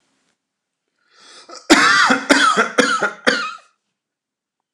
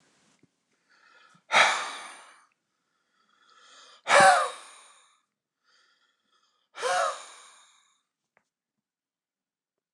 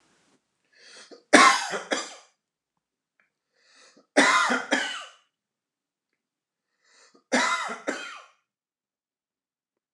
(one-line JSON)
{"cough_length": "4.7 s", "cough_amplitude": 29204, "cough_signal_mean_std_ratio": 0.45, "exhalation_length": "9.9 s", "exhalation_amplitude": 18697, "exhalation_signal_mean_std_ratio": 0.26, "three_cough_length": "9.9 s", "three_cough_amplitude": 29076, "three_cough_signal_mean_std_ratio": 0.3, "survey_phase": "beta (2021-08-13 to 2022-03-07)", "age": "45-64", "gender": "Male", "wearing_mask": "No", "symptom_cough_any": true, "symptom_sore_throat": true, "smoker_status": "Ex-smoker", "respiratory_condition_asthma": false, "respiratory_condition_other": false, "recruitment_source": "Test and Trace", "submission_delay": "2 days", "covid_test_result": "Positive", "covid_test_method": "RT-qPCR", "covid_ct_value": 32.9, "covid_ct_gene": "ORF1ab gene"}